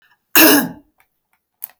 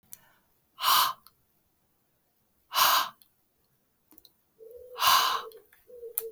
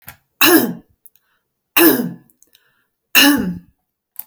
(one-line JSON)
{"cough_length": "1.8 s", "cough_amplitude": 32768, "cough_signal_mean_std_ratio": 0.35, "exhalation_length": "6.3 s", "exhalation_amplitude": 16292, "exhalation_signal_mean_std_ratio": 0.36, "three_cough_length": "4.3 s", "three_cough_amplitude": 32768, "three_cough_signal_mean_std_ratio": 0.39, "survey_phase": "beta (2021-08-13 to 2022-03-07)", "age": "45-64", "gender": "Female", "wearing_mask": "No", "symptom_none": true, "smoker_status": "Never smoked", "respiratory_condition_asthma": false, "respiratory_condition_other": false, "recruitment_source": "REACT", "submission_delay": "1 day", "covid_test_result": "Negative", "covid_test_method": "RT-qPCR", "influenza_a_test_result": "Negative", "influenza_b_test_result": "Negative"}